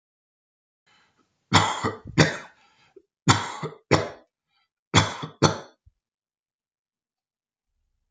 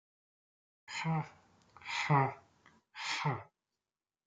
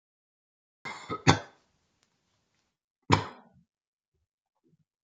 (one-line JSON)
{"three_cough_length": "8.1 s", "three_cough_amplitude": 26957, "three_cough_signal_mean_std_ratio": 0.29, "exhalation_length": "4.3 s", "exhalation_amplitude": 5286, "exhalation_signal_mean_std_ratio": 0.4, "cough_length": "5.0 s", "cough_amplitude": 21235, "cough_signal_mean_std_ratio": 0.19, "survey_phase": "beta (2021-08-13 to 2022-03-07)", "age": "65+", "gender": "Male", "wearing_mask": "No", "symptom_cough_any": true, "symptom_fatigue": true, "smoker_status": "Never smoked", "respiratory_condition_asthma": false, "respiratory_condition_other": false, "recruitment_source": "REACT", "submission_delay": "1 day", "covid_test_result": "Negative", "covid_test_method": "RT-qPCR"}